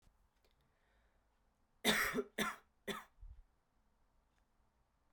three_cough_length: 5.1 s
three_cough_amplitude: 3716
three_cough_signal_mean_std_ratio: 0.3
survey_phase: beta (2021-08-13 to 2022-03-07)
age: 18-44
gender: Male
wearing_mask: 'No'
symptom_cough_any: true
symptom_runny_or_blocked_nose: true
symptom_sore_throat: true
symptom_onset: 8 days
smoker_status: Prefer not to say
respiratory_condition_asthma: false
respiratory_condition_other: false
recruitment_source: Test and Trace
submission_delay: 2 days
covid_test_result: Positive
covid_test_method: RT-qPCR
covid_ct_value: 11.4
covid_ct_gene: ORF1ab gene
covid_ct_mean: 11.8
covid_viral_load: 130000000 copies/ml
covid_viral_load_category: High viral load (>1M copies/ml)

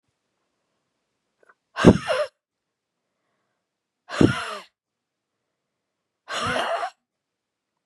exhalation_length: 7.9 s
exhalation_amplitude: 32768
exhalation_signal_mean_std_ratio: 0.24
survey_phase: beta (2021-08-13 to 2022-03-07)
age: 45-64
gender: Female
wearing_mask: 'No'
symptom_cough_any: true
symptom_new_continuous_cough: true
symptom_runny_or_blocked_nose: true
symptom_fatigue: true
symptom_headache: true
symptom_change_to_sense_of_smell_or_taste: true
symptom_loss_of_taste: true
symptom_other: true
smoker_status: Never smoked
respiratory_condition_asthma: true
respiratory_condition_other: false
recruitment_source: Test and Trace
submission_delay: 2 days
covid_test_result: Positive
covid_test_method: LFT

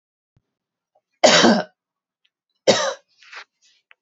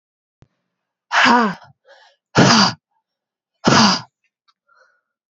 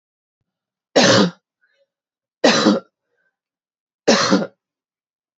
cough_length: 4.0 s
cough_amplitude: 28080
cough_signal_mean_std_ratio: 0.31
exhalation_length: 5.3 s
exhalation_amplitude: 30081
exhalation_signal_mean_std_ratio: 0.38
three_cough_length: 5.4 s
three_cough_amplitude: 32768
three_cough_signal_mean_std_ratio: 0.36
survey_phase: alpha (2021-03-01 to 2021-08-12)
age: 18-44
gender: Female
wearing_mask: 'No'
symptom_abdominal_pain: true
symptom_fatigue: true
symptom_fever_high_temperature: true
symptom_headache: true
symptom_onset: 2 days
smoker_status: Never smoked
respiratory_condition_asthma: true
respiratory_condition_other: false
recruitment_source: Test and Trace
submission_delay: 2 days
covid_test_result: Positive
covid_test_method: RT-qPCR
covid_ct_value: 16.8
covid_ct_gene: ORF1ab gene
covid_ct_mean: 17.2
covid_viral_load: 2400000 copies/ml
covid_viral_load_category: High viral load (>1M copies/ml)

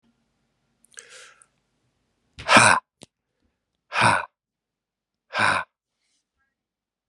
exhalation_length: 7.1 s
exhalation_amplitude: 31913
exhalation_signal_mean_std_ratio: 0.26
survey_phase: beta (2021-08-13 to 2022-03-07)
age: 18-44
gender: Male
wearing_mask: 'No'
symptom_cough_any: true
symptom_runny_or_blocked_nose: true
symptom_sore_throat: true
symptom_fatigue: true
symptom_fever_high_temperature: true
symptom_headache: true
symptom_loss_of_taste: true
symptom_onset: 7 days
smoker_status: Never smoked
respiratory_condition_asthma: false
respiratory_condition_other: false
recruitment_source: Test and Trace
submission_delay: 5 days
covid_test_result: Positive
covid_test_method: RT-qPCR
covid_ct_value: 13.8
covid_ct_gene: ORF1ab gene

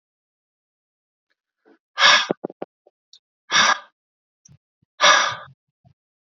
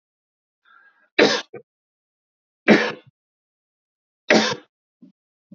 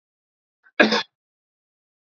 exhalation_length: 6.4 s
exhalation_amplitude: 32768
exhalation_signal_mean_std_ratio: 0.29
three_cough_length: 5.5 s
three_cough_amplitude: 28241
three_cough_signal_mean_std_ratio: 0.26
cough_length: 2.0 s
cough_amplitude: 32767
cough_signal_mean_std_ratio: 0.23
survey_phase: beta (2021-08-13 to 2022-03-07)
age: 65+
gender: Male
wearing_mask: 'No'
symptom_none: true
smoker_status: Never smoked
respiratory_condition_asthma: false
respiratory_condition_other: false
recruitment_source: REACT
submission_delay: 2 days
covid_test_result: Negative
covid_test_method: RT-qPCR
influenza_a_test_result: Negative
influenza_b_test_result: Negative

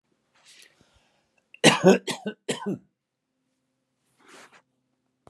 cough_length: 5.3 s
cough_amplitude: 27518
cough_signal_mean_std_ratio: 0.23
survey_phase: beta (2021-08-13 to 2022-03-07)
age: 65+
gender: Male
wearing_mask: 'No'
symptom_none: true
smoker_status: Never smoked
respiratory_condition_asthma: false
respiratory_condition_other: false
recruitment_source: REACT
submission_delay: 1 day
covid_test_result: Negative
covid_test_method: RT-qPCR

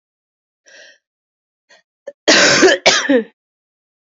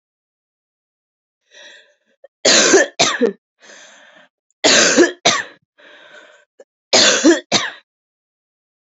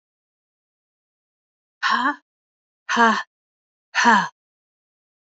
cough_length: 4.2 s
cough_amplitude: 31075
cough_signal_mean_std_ratio: 0.37
three_cough_length: 9.0 s
three_cough_amplitude: 32399
three_cough_signal_mean_std_ratio: 0.38
exhalation_length: 5.4 s
exhalation_amplitude: 26282
exhalation_signal_mean_std_ratio: 0.32
survey_phase: beta (2021-08-13 to 2022-03-07)
age: 18-44
gender: Female
wearing_mask: 'No'
symptom_cough_any: true
symptom_runny_or_blocked_nose: true
symptom_sore_throat: true
symptom_fatigue: true
symptom_headache: true
symptom_change_to_sense_of_smell_or_taste: true
symptom_onset: 2 days
smoker_status: Never smoked
respiratory_condition_asthma: false
respiratory_condition_other: false
recruitment_source: Test and Trace
submission_delay: 1 day
covid_test_result: Positive
covid_test_method: RT-qPCR
covid_ct_value: 19.5
covid_ct_gene: ORF1ab gene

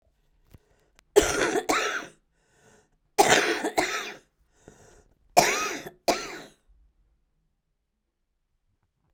three_cough_length: 9.1 s
three_cough_amplitude: 23807
three_cough_signal_mean_std_ratio: 0.35
survey_phase: beta (2021-08-13 to 2022-03-07)
age: 45-64
gender: Female
wearing_mask: 'Yes'
symptom_cough_any: true
symptom_runny_or_blocked_nose: true
symptom_shortness_of_breath: true
symptom_sore_throat: true
symptom_diarrhoea: true
symptom_fatigue: true
symptom_fever_high_temperature: true
symptom_headache: true
symptom_change_to_sense_of_smell_or_taste: true
symptom_loss_of_taste: true
symptom_other: true
symptom_onset: 4 days
smoker_status: Current smoker (11 or more cigarettes per day)
respiratory_condition_asthma: false
respiratory_condition_other: false
recruitment_source: Test and Trace
submission_delay: 2 days
covid_test_result: Positive
covid_test_method: RT-qPCR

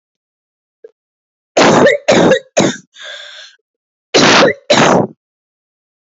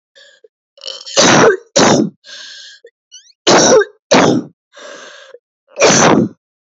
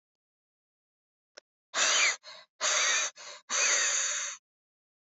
cough_length: 6.1 s
cough_amplitude: 31912
cough_signal_mean_std_ratio: 0.47
three_cough_length: 6.7 s
three_cough_amplitude: 32657
three_cough_signal_mean_std_ratio: 0.51
exhalation_length: 5.1 s
exhalation_amplitude: 8833
exhalation_signal_mean_std_ratio: 0.51
survey_phase: beta (2021-08-13 to 2022-03-07)
age: 18-44
gender: Female
wearing_mask: 'No'
symptom_new_continuous_cough: true
symptom_runny_or_blocked_nose: true
symptom_sore_throat: true
symptom_fatigue: true
symptom_fever_high_temperature: true
symptom_headache: true
symptom_change_to_sense_of_smell_or_taste: true
symptom_onset: 6 days
smoker_status: Never smoked
respiratory_condition_asthma: false
respiratory_condition_other: false
recruitment_source: Test and Trace
submission_delay: 0 days
covid_test_result: Negative
covid_test_method: RT-qPCR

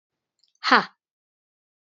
exhalation_length: 1.9 s
exhalation_amplitude: 29011
exhalation_signal_mean_std_ratio: 0.2
survey_phase: beta (2021-08-13 to 2022-03-07)
age: 45-64
gender: Female
wearing_mask: 'No'
symptom_cough_any: true
symptom_runny_or_blocked_nose: true
symptom_shortness_of_breath: true
symptom_sore_throat: true
symptom_fatigue: true
symptom_headache: true
smoker_status: Never smoked
respiratory_condition_asthma: false
respiratory_condition_other: false
recruitment_source: Test and Trace
submission_delay: 1 day
covid_test_result: Positive
covid_test_method: RT-qPCR
covid_ct_value: 22.1
covid_ct_gene: N gene
covid_ct_mean: 22.7
covid_viral_load: 35000 copies/ml
covid_viral_load_category: Low viral load (10K-1M copies/ml)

